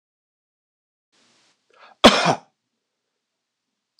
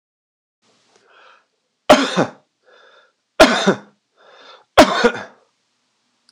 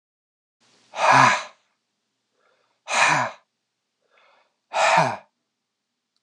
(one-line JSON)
{"cough_length": "4.0 s", "cough_amplitude": 26028, "cough_signal_mean_std_ratio": 0.19, "three_cough_length": "6.3 s", "three_cough_amplitude": 26028, "three_cough_signal_mean_std_ratio": 0.29, "exhalation_length": "6.2 s", "exhalation_amplitude": 24713, "exhalation_signal_mean_std_ratio": 0.35, "survey_phase": "beta (2021-08-13 to 2022-03-07)", "age": "45-64", "gender": "Male", "wearing_mask": "No", "symptom_none": true, "smoker_status": "Never smoked", "respiratory_condition_asthma": true, "respiratory_condition_other": false, "recruitment_source": "REACT", "submission_delay": "4 days", "covid_test_result": "Negative", "covid_test_method": "RT-qPCR"}